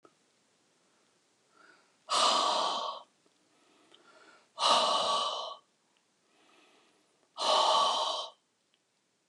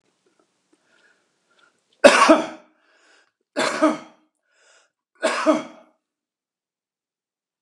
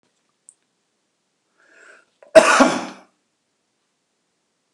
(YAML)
exhalation_length: 9.3 s
exhalation_amplitude: 7419
exhalation_signal_mean_std_ratio: 0.45
three_cough_length: 7.6 s
three_cough_amplitude: 32768
three_cough_signal_mean_std_ratio: 0.27
cough_length: 4.7 s
cough_amplitude: 32768
cough_signal_mean_std_ratio: 0.22
survey_phase: beta (2021-08-13 to 2022-03-07)
age: 65+
gender: Male
wearing_mask: 'No'
symptom_none: true
smoker_status: Never smoked
respiratory_condition_asthma: false
respiratory_condition_other: false
recruitment_source: REACT
submission_delay: 2 days
covid_test_result: Negative
covid_test_method: RT-qPCR